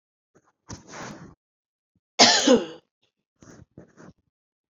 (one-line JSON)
{"cough_length": "4.7 s", "cough_amplitude": 27681, "cough_signal_mean_std_ratio": 0.26, "survey_phase": "beta (2021-08-13 to 2022-03-07)", "age": "45-64", "gender": "Female", "wearing_mask": "No", "symptom_runny_or_blocked_nose": true, "symptom_fatigue": true, "symptom_headache": true, "smoker_status": "Never smoked", "respiratory_condition_asthma": false, "respiratory_condition_other": false, "recruitment_source": "Test and Trace", "submission_delay": "1 day", "covid_test_result": "Positive", "covid_test_method": "ePCR"}